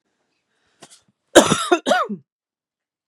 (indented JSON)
{
  "cough_length": "3.1 s",
  "cough_amplitude": 32768,
  "cough_signal_mean_std_ratio": 0.3,
  "survey_phase": "beta (2021-08-13 to 2022-03-07)",
  "age": "18-44",
  "gender": "Female",
  "wearing_mask": "No",
  "symptom_none": true,
  "smoker_status": "Ex-smoker",
  "respiratory_condition_asthma": false,
  "respiratory_condition_other": false,
  "recruitment_source": "REACT",
  "submission_delay": "1 day",
  "covid_test_result": "Negative",
  "covid_test_method": "RT-qPCR",
  "influenza_a_test_result": "Negative",
  "influenza_b_test_result": "Negative"
}